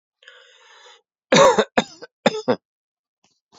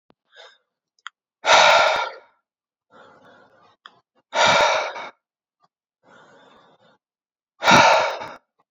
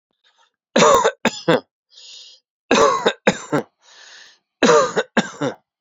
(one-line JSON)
{"cough_length": "3.6 s", "cough_amplitude": 28521, "cough_signal_mean_std_ratio": 0.3, "exhalation_length": "8.7 s", "exhalation_amplitude": 28327, "exhalation_signal_mean_std_ratio": 0.36, "three_cough_length": "5.8 s", "three_cough_amplitude": 29967, "three_cough_signal_mean_std_ratio": 0.43, "survey_phase": "beta (2021-08-13 to 2022-03-07)", "age": "18-44", "gender": "Male", "wearing_mask": "No", "symptom_none": true, "smoker_status": "Never smoked", "respiratory_condition_asthma": false, "respiratory_condition_other": false, "recruitment_source": "REACT", "submission_delay": "2 days", "covid_test_result": "Negative", "covid_test_method": "RT-qPCR"}